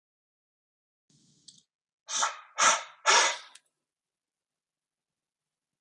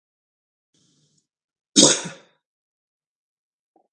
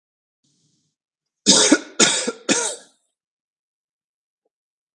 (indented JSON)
{
  "exhalation_length": "5.8 s",
  "exhalation_amplitude": 13247,
  "exhalation_signal_mean_std_ratio": 0.27,
  "cough_length": "3.9 s",
  "cough_amplitude": 32768,
  "cough_signal_mean_std_ratio": 0.19,
  "three_cough_length": "4.9 s",
  "three_cough_amplitude": 32768,
  "three_cough_signal_mean_std_ratio": 0.31,
  "survey_phase": "beta (2021-08-13 to 2022-03-07)",
  "age": "45-64",
  "gender": "Male",
  "wearing_mask": "No",
  "symptom_none": true,
  "smoker_status": "Never smoked",
  "respiratory_condition_asthma": false,
  "respiratory_condition_other": false,
  "recruitment_source": "REACT",
  "submission_delay": "2 days",
  "covid_test_result": "Negative",
  "covid_test_method": "RT-qPCR",
  "influenza_a_test_result": "Unknown/Void",
  "influenza_b_test_result": "Unknown/Void"
}